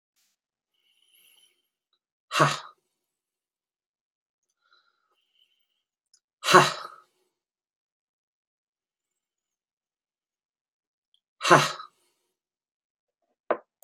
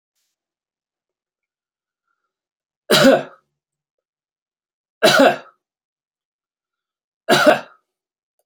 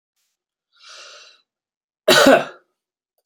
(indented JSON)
{
  "exhalation_length": "13.8 s",
  "exhalation_amplitude": 26013,
  "exhalation_signal_mean_std_ratio": 0.17,
  "three_cough_length": "8.5 s",
  "three_cough_amplitude": 31708,
  "three_cough_signal_mean_std_ratio": 0.26,
  "cough_length": "3.3 s",
  "cough_amplitude": 29075,
  "cough_signal_mean_std_ratio": 0.27,
  "survey_phase": "beta (2021-08-13 to 2022-03-07)",
  "age": "45-64",
  "gender": "Male",
  "wearing_mask": "No",
  "symptom_runny_or_blocked_nose": true,
  "symptom_other": true,
  "smoker_status": "Never smoked",
  "respiratory_condition_asthma": false,
  "respiratory_condition_other": false,
  "recruitment_source": "Test and Trace",
  "submission_delay": "2 days",
  "covid_test_result": "Positive",
  "covid_test_method": "RT-qPCR",
  "covid_ct_value": 19.9,
  "covid_ct_gene": "ORF1ab gene",
  "covid_ct_mean": 20.7,
  "covid_viral_load": "170000 copies/ml",
  "covid_viral_load_category": "Low viral load (10K-1M copies/ml)"
}